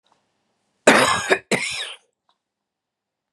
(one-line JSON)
{"cough_length": "3.3 s", "cough_amplitude": 32768, "cough_signal_mean_std_ratio": 0.34, "survey_phase": "beta (2021-08-13 to 2022-03-07)", "age": "65+", "gender": "Female", "wearing_mask": "No", "symptom_loss_of_taste": true, "smoker_status": "Never smoked", "respiratory_condition_asthma": true, "respiratory_condition_other": false, "recruitment_source": "REACT", "submission_delay": "1 day", "covid_test_result": "Negative", "covid_test_method": "RT-qPCR", "influenza_a_test_result": "Negative", "influenza_b_test_result": "Negative"}